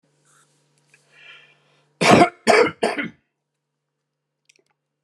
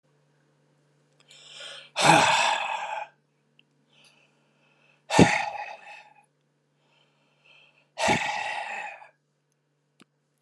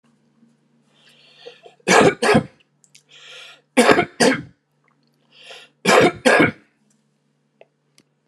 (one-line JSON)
{"cough_length": "5.0 s", "cough_amplitude": 32070, "cough_signal_mean_std_ratio": 0.28, "exhalation_length": "10.4 s", "exhalation_amplitude": 30577, "exhalation_signal_mean_std_ratio": 0.34, "three_cough_length": "8.3 s", "three_cough_amplitude": 32767, "three_cough_signal_mean_std_ratio": 0.35, "survey_phase": "alpha (2021-03-01 to 2021-08-12)", "age": "65+", "gender": "Male", "wearing_mask": "No", "symptom_none": true, "smoker_status": "Never smoked", "respiratory_condition_asthma": false, "respiratory_condition_other": false, "recruitment_source": "REACT", "submission_delay": "2 days", "covid_test_result": "Negative", "covid_test_method": "RT-qPCR"}